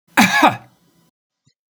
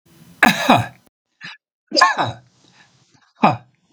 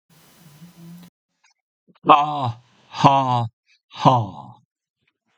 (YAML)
cough_length: 1.7 s
cough_amplitude: 32768
cough_signal_mean_std_ratio: 0.36
three_cough_length: 3.9 s
three_cough_amplitude: 32768
three_cough_signal_mean_std_ratio: 0.36
exhalation_length: 5.4 s
exhalation_amplitude: 32768
exhalation_signal_mean_std_ratio: 0.36
survey_phase: beta (2021-08-13 to 2022-03-07)
age: 65+
gender: Male
wearing_mask: 'No'
symptom_none: true
smoker_status: Ex-smoker
respiratory_condition_asthma: false
respiratory_condition_other: false
recruitment_source: REACT
submission_delay: 6 days
covid_test_result: Negative
covid_test_method: RT-qPCR
influenza_a_test_result: Negative
influenza_b_test_result: Negative